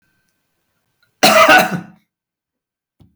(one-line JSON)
{"cough_length": "3.2 s", "cough_amplitude": 32768, "cough_signal_mean_std_ratio": 0.34, "survey_phase": "beta (2021-08-13 to 2022-03-07)", "age": "65+", "gender": "Male", "wearing_mask": "No", "symptom_headache": true, "smoker_status": "Ex-smoker", "respiratory_condition_asthma": false, "respiratory_condition_other": false, "recruitment_source": "REACT", "submission_delay": "2 days", "covid_test_result": "Negative", "covid_test_method": "RT-qPCR", "influenza_a_test_result": "Negative", "influenza_b_test_result": "Negative"}